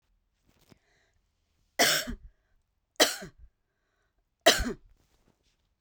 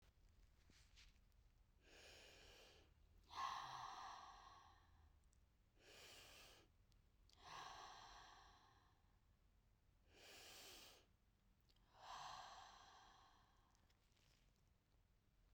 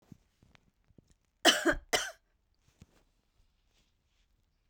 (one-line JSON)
{"three_cough_length": "5.8 s", "three_cough_amplitude": 18868, "three_cough_signal_mean_std_ratio": 0.25, "exhalation_length": "15.5 s", "exhalation_amplitude": 471, "exhalation_signal_mean_std_ratio": 0.59, "cough_length": "4.7 s", "cough_amplitude": 11039, "cough_signal_mean_std_ratio": 0.22, "survey_phase": "beta (2021-08-13 to 2022-03-07)", "age": "45-64", "gender": "Female", "wearing_mask": "Yes", "symptom_sore_throat": true, "symptom_abdominal_pain": true, "symptom_headache": true, "symptom_loss_of_taste": true, "smoker_status": "Never smoked", "respiratory_condition_asthma": false, "respiratory_condition_other": false, "recruitment_source": "Test and Trace", "submission_delay": "1 day", "covid_test_result": "Positive", "covid_test_method": "RT-qPCR", "covid_ct_value": 29.5, "covid_ct_gene": "ORF1ab gene", "covid_ct_mean": 30.0, "covid_viral_load": "140 copies/ml", "covid_viral_load_category": "Minimal viral load (< 10K copies/ml)"}